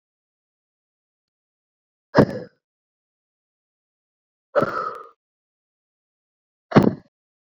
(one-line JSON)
{"exhalation_length": "7.5 s", "exhalation_amplitude": 27728, "exhalation_signal_mean_std_ratio": 0.2, "survey_phase": "beta (2021-08-13 to 2022-03-07)", "age": "18-44", "gender": "Female", "wearing_mask": "No", "symptom_runny_or_blocked_nose": true, "symptom_sore_throat": true, "symptom_abdominal_pain": true, "symptom_fatigue": true, "symptom_onset": "12 days", "smoker_status": "Ex-smoker", "respiratory_condition_asthma": false, "respiratory_condition_other": false, "recruitment_source": "REACT", "submission_delay": "1 day", "covid_test_result": "Negative", "covid_test_method": "RT-qPCR"}